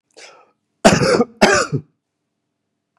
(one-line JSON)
{"cough_length": "3.0 s", "cough_amplitude": 32768, "cough_signal_mean_std_ratio": 0.38, "survey_phase": "beta (2021-08-13 to 2022-03-07)", "age": "65+", "gender": "Male", "wearing_mask": "No", "symptom_cough_any": true, "symptom_runny_or_blocked_nose": true, "symptom_fatigue": true, "symptom_headache": true, "symptom_change_to_sense_of_smell_or_taste": true, "symptom_onset": "8 days", "smoker_status": "Ex-smoker", "respiratory_condition_asthma": false, "respiratory_condition_other": false, "recruitment_source": "Test and Trace", "submission_delay": "2 days", "covid_test_result": "Positive", "covid_test_method": "RT-qPCR", "covid_ct_value": 17.8, "covid_ct_gene": "ORF1ab gene", "covid_ct_mean": 19.0, "covid_viral_load": "600000 copies/ml", "covid_viral_load_category": "Low viral load (10K-1M copies/ml)"}